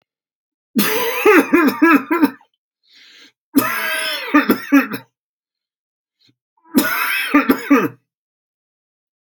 {"three_cough_length": "9.4 s", "three_cough_amplitude": 32768, "three_cough_signal_mean_std_ratio": 0.47, "survey_phase": "alpha (2021-03-01 to 2021-08-12)", "age": "65+", "gender": "Male", "wearing_mask": "No", "symptom_none": true, "smoker_status": "Never smoked", "respiratory_condition_asthma": false, "respiratory_condition_other": false, "recruitment_source": "REACT", "submission_delay": "1 day", "covid_test_result": "Negative", "covid_test_method": "RT-qPCR"}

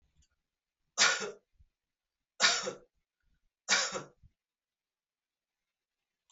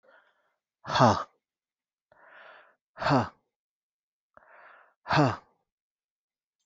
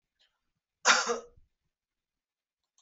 {"three_cough_length": "6.3 s", "three_cough_amplitude": 9065, "three_cough_signal_mean_std_ratio": 0.27, "exhalation_length": "6.7 s", "exhalation_amplitude": 19336, "exhalation_signal_mean_std_ratio": 0.26, "cough_length": "2.8 s", "cough_amplitude": 15039, "cough_signal_mean_std_ratio": 0.24, "survey_phase": "beta (2021-08-13 to 2022-03-07)", "age": "18-44", "gender": "Male", "wearing_mask": "No", "symptom_none": true, "smoker_status": "Never smoked", "respiratory_condition_asthma": false, "respiratory_condition_other": false, "recruitment_source": "REACT", "submission_delay": "0 days", "covid_test_result": "Negative", "covid_test_method": "RT-qPCR"}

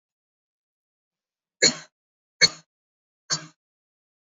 {"three_cough_length": "4.4 s", "three_cough_amplitude": 26938, "three_cough_signal_mean_std_ratio": 0.18, "survey_phase": "beta (2021-08-13 to 2022-03-07)", "age": "18-44", "gender": "Female", "wearing_mask": "No", "symptom_none": true, "smoker_status": "Never smoked", "respiratory_condition_asthma": false, "respiratory_condition_other": false, "recruitment_source": "REACT", "submission_delay": "2 days", "covid_test_result": "Negative", "covid_test_method": "RT-qPCR", "influenza_a_test_result": "Unknown/Void", "influenza_b_test_result": "Unknown/Void"}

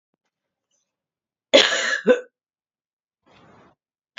{"cough_length": "4.2 s", "cough_amplitude": 29624, "cough_signal_mean_std_ratio": 0.26, "survey_phase": "beta (2021-08-13 to 2022-03-07)", "age": "45-64", "gender": "Female", "wearing_mask": "No", "symptom_new_continuous_cough": true, "symptom_runny_or_blocked_nose": true, "symptom_shortness_of_breath": true, "symptom_sore_throat": true, "symptom_fatigue": true, "symptom_headache": true, "symptom_change_to_sense_of_smell_or_taste": true, "symptom_onset": "4 days", "smoker_status": "Never smoked", "respiratory_condition_asthma": false, "respiratory_condition_other": false, "recruitment_source": "Test and Trace", "submission_delay": "2 days", "covid_test_result": "Positive", "covid_test_method": "RT-qPCR", "covid_ct_value": 21.9, "covid_ct_gene": "N gene", "covid_ct_mean": 22.4, "covid_viral_load": "45000 copies/ml", "covid_viral_load_category": "Low viral load (10K-1M copies/ml)"}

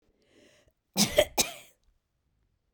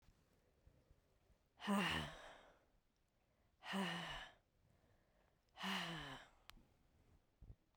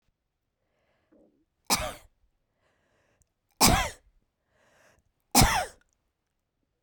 {"cough_length": "2.7 s", "cough_amplitude": 16966, "cough_signal_mean_std_ratio": 0.26, "exhalation_length": "7.8 s", "exhalation_amplitude": 1257, "exhalation_signal_mean_std_ratio": 0.41, "three_cough_length": "6.8 s", "three_cough_amplitude": 18463, "three_cough_signal_mean_std_ratio": 0.25, "survey_phase": "beta (2021-08-13 to 2022-03-07)", "age": "45-64", "gender": "Female", "wearing_mask": "No", "symptom_shortness_of_breath": true, "symptom_fatigue": true, "symptom_onset": "12 days", "smoker_status": "Never smoked", "respiratory_condition_asthma": false, "respiratory_condition_other": false, "recruitment_source": "REACT", "submission_delay": "2 days", "covid_test_result": "Negative", "covid_test_method": "RT-qPCR"}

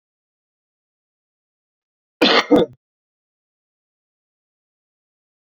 {"cough_length": "5.5 s", "cough_amplitude": 27846, "cough_signal_mean_std_ratio": 0.2, "survey_phase": "beta (2021-08-13 to 2022-03-07)", "age": "45-64", "gender": "Male", "wearing_mask": "No", "symptom_cough_any": true, "symptom_fatigue": true, "symptom_change_to_sense_of_smell_or_taste": true, "symptom_onset": "7 days", "smoker_status": "Ex-smoker", "respiratory_condition_asthma": false, "respiratory_condition_other": false, "recruitment_source": "Test and Trace", "submission_delay": "3 days", "covid_test_result": "Positive", "covid_test_method": "RT-qPCR", "covid_ct_value": 33.5, "covid_ct_gene": "N gene"}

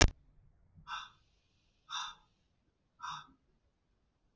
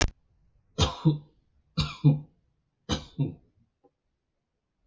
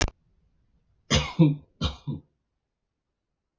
{"exhalation_length": "4.4 s", "exhalation_amplitude": 15695, "exhalation_signal_mean_std_ratio": 0.19, "three_cough_length": "4.9 s", "three_cough_amplitude": 15685, "three_cough_signal_mean_std_ratio": 0.32, "cough_length": "3.6 s", "cough_amplitude": 15617, "cough_signal_mean_std_ratio": 0.3, "survey_phase": "beta (2021-08-13 to 2022-03-07)", "age": "18-44", "gender": "Male", "wearing_mask": "No", "symptom_none": true, "smoker_status": "Never smoked", "respiratory_condition_asthma": false, "respiratory_condition_other": false, "recruitment_source": "REACT", "submission_delay": "1 day", "covid_test_result": "Negative", "covid_test_method": "RT-qPCR"}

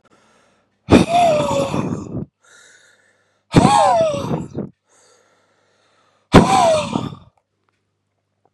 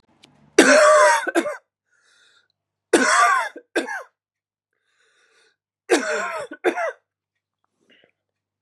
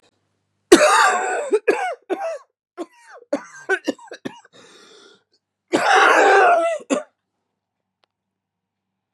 {"exhalation_length": "8.5 s", "exhalation_amplitude": 32768, "exhalation_signal_mean_std_ratio": 0.44, "three_cough_length": "8.6 s", "three_cough_amplitude": 32767, "three_cough_signal_mean_std_ratio": 0.39, "cough_length": "9.1 s", "cough_amplitude": 32768, "cough_signal_mean_std_ratio": 0.43, "survey_phase": "beta (2021-08-13 to 2022-03-07)", "age": "18-44", "gender": "Male", "wearing_mask": "No", "symptom_cough_any": true, "symptom_runny_or_blocked_nose": true, "symptom_shortness_of_breath": true, "symptom_sore_throat": true, "symptom_fatigue": true, "symptom_fever_high_temperature": true, "symptom_headache": true, "symptom_onset": "3 days", "smoker_status": "Ex-smoker", "respiratory_condition_asthma": true, "respiratory_condition_other": false, "recruitment_source": "Test and Trace", "submission_delay": "2 days", "covid_test_result": "Positive", "covid_test_method": "RT-qPCR", "covid_ct_value": 23.3, "covid_ct_gene": "N gene", "covid_ct_mean": 23.4, "covid_viral_load": "21000 copies/ml", "covid_viral_load_category": "Low viral load (10K-1M copies/ml)"}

